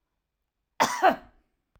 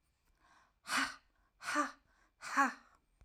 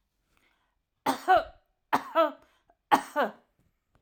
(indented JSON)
{
  "cough_length": "1.8 s",
  "cough_amplitude": 17333,
  "cough_signal_mean_std_ratio": 0.3,
  "exhalation_length": "3.2 s",
  "exhalation_amplitude": 4247,
  "exhalation_signal_mean_std_ratio": 0.37,
  "three_cough_length": "4.0 s",
  "three_cough_amplitude": 14066,
  "three_cough_signal_mean_std_ratio": 0.33,
  "survey_phase": "alpha (2021-03-01 to 2021-08-12)",
  "age": "45-64",
  "gender": "Female",
  "wearing_mask": "No",
  "symptom_none": true,
  "smoker_status": "Ex-smoker",
  "respiratory_condition_asthma": false,
  "respiratory_condition_other": false,
  "recruitment_source": "REACT",
  "submission_delay": "1 day",
  "covid_test_result": "Negative",
  "covid_test_method": "RT-qPCR"
}